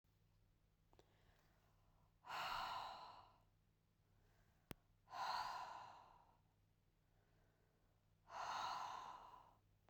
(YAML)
exhalation_length: 9.9 s
exhalation_amplitude: 1005
exhalation_signal_mean_std_ratio: 0.49
survey_phase: beta (2021-08-13 to 2022-03-07)
age: 45-64
gender: Female
wearing_mask: 'No'
symptom_none: true
smoker_status: Never smoked
respiratory_condition_asthma: false
respiratory_condition_other: false
recruitment_source: REACT
submission_delay: 2 days
covid_test_result: Negative
covid_test_method: RT-qPCR